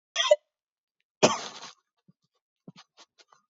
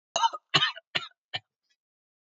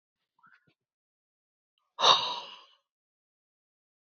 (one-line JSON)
{"cough_length": "3.5 s", "cough_amplitude": 18064, "cough_signal_mean_std_ratio": 0.23, "three_cough_length": "2.3 s", "three_cough_amplitude": 14465, "three_cough_signal_mean_std_ratio": 0.32, "exhalation_length": "4.1 s", "exhalation_amplitude": 18744, "exhalation_signal_mean_std_ratio": 0.21, "survey_phase": "beta (2021-08-13 to 2022-03-07)", "age": "18-44", "gender": "Male", "wearing_mask": "No", "symptom_runny_or_blocked_nose": true, "smoker_status": "Never smoked", "respiratory_condition_asthma": false, "respiratory_condition_other": false, "recruitment_source": "REACT", "submission_delay": "1 day", "covid_test_result": "Negative", "covid_test_method": "RT-qPCR"}